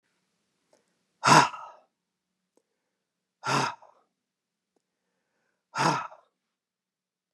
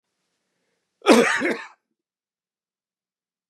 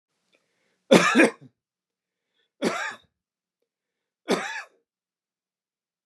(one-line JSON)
{"exhalation_length": "7.3 s", "exhalation_amplitude": 20793, "exhalation_signal_mean_std_ratio": 0.23, "cough_length": "3.5 s", "cough_amplitude": 29936, "cough_signal_mean_std_ratio": 0.27, "three_cough_length": "6.1 s", "three_cough_amplitude": 28960, "three_cough_signal_mean_std_ratio": 0.26, "survey_phase": "beta (2021-08-13 to 2022-03-07)", "age": "45-64", "gender": "Male", "wearing_mask": "No", "symptom_none": true, "smoker_status": "Never smoked", "respiratory_condition_asthma": false, "respiratory_condition_other": false, "recruitment_source": "REACT", "submission_delay": "2 days", "covid_test_result": "Negative", "covid_test_method": "RT-qPCR", "influenza_a_test_result": "Negative", "influenza_b_test_result": "Negative"}